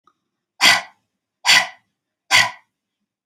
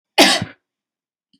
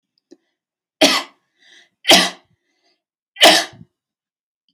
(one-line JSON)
{"exhalation_length": "3.3 s", "exhalation_amplitude": 32768, "exhalation_signal_mean_std_ratio": 0.33, "cough_length": "1.4 s", "cough_amplitude": 31589, "cough_signal_mean_std_ratio": 0.33, "three_cough_length": "4.7 s", "three_cough_amplitude": 32768, "three_cough_signal_mean_std_ratio": 0.29, "survey_phase": "alpha (2021-03-01 to 2021-08-12)", "age": "45-64", "gender": "Female", "wearing_mask": "No", "symptom_none": true, "smoker_status": "Never smoked", "respiratory_condition_asthma": false, "respiratory_condition_other": false, "recruitment_source": "REACT", "submission_delay": "3 days", "covid_test_result": "Negative", "covid_test_method": "RT-qPCR"}